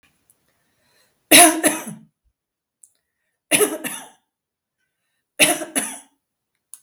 {"three_cough_length": "6.8 s", "three_cough_amplitude": 32768, "three_cough_signal_mean_std_ratio": 0.28, "survey_phase": "beta (2021-08-13 to 2022-03-07)", "age": "65+", "gender": "Female", "wearing_mask": "No", "symptom_runny_or_blocked_nose": true, "symptom_sore_throat": true, "smoker_status": "Never smoked", "respiratory_condition_asthma": false, "respiratory_condition_other": false, "recruitment_source": "REACT", "submission_delay": "1 day", "covid_test_result": "Negative", "covid_test_method": "RT-qPCR"}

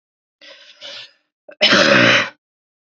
{"cough_length": "3.0 s", "cough_amplitude": 32768, "cough_signal_mean_std_ratio": 0.41, "survey_phase": "beta (2021-08-13 to 2022-03-07)", "age": "18-44", "gender": "Female", "wearing_mask": "No", "symptom_runny_or_blocked_nose": true, "symptom_headache": true, "symptom_change_to_sense_of_smell_or_taste": true, "symptom_loss_of_taste": true, "symptom_onset": "5 days", "smoker_status": "Current smoker (1 to 10 cigarettes per day)", "respiratory_condition_asthma": false, "respiratory_condition_other": false, "recruitment_source": "Test and Trace", "submission_delay": "2 days", "covid_test_result": "Positive", "covid_test_method": "RT-qPCR"}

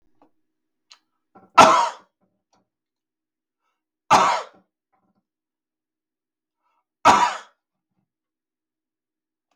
{"three_cough_length": "9.6 s", "three_cough_amplitude": 32768, "three_cough_signal_mean_std_ratio": 0.23, "survey_phase": "beta (2021-08-13 to 2022-03-07)", "age": "65+", "gender": "Male", "wearing_mask": "No", "symptom_none": true, "smoker_status": "Never smoked", "respiratory_condition_asthma": false, "respiratory_condition_other": false, "recruitment_source": "Test and Trace", "submission_delay": "0 days", "covid_test_result": "Negative", "covid_test_method": "LFT"}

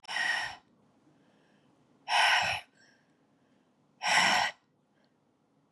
{"exhalation_length": "5.7 s", "exhalation_amplitude": 8764, "exhalation_signal_mean_std_ratio": 0.41, "survey_phase": "beta (2021-08-13 to 2022-03-07)", "age": "45-64", "gender": "Female", "wearing_mask": "No", "symptom_cough_any": true, "symptom_new_continuous_cough": true, "symptom_runny_or_blocked_nose": true, "symptom_shortness_of_breath": true, "symptom_sore_throat": true, "symptom_fatigue": true, "symptom_fever_high_temperature": true, "symptom_headache": true, "symptom_change_to_sense_of_smell_or_taste": true, "symptom_onset": "4 days", "smoker_status": "Ex-smoker", "respiratory_condition_asthma": false, "respiratory_condition_other": false, "recruitment_source": "Test and Trace", "submission_delay": "1 day", "covid_test_result": "Positive", "covid_test_method": "RT-qPCR", "covid_ct_value": 12.1, "covid_ct_gene": "ORF1ab gene"}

